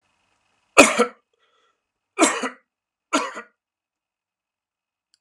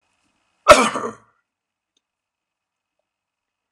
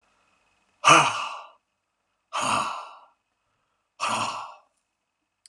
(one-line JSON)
{"three_cough_length": "5.2 s", "three_cough_amplitude": 32768, "three_cough_signal_mean_std_ratio": 0.24, "cough_length": "3.7 s", "cough_amplitude": 32768, "cough_signal_mean_std_ratio": 0.19, "exhalation_length": "5.5 s", "exhalation_amplitude": 24502, "exhalation_signal_mean_std_ratio": 0.33, "survey_phase": "beta (2021-08-13 to 2022-03-07)", "age": "45-64", "gender": "Male", "wearing_mask": "No", "symptom_cough_any": true, "symptom_runny_or_blocked_nose": true, "smoker_status": "Ex-smoker", "respiratory_condition_asthma": true, "respiratory_condition_other": false, "recruitment_source": "Test and Trace", "submission_delay": "1 day", "covid_test_result": "Negative", "covid_test_method": "RT-qPCR"}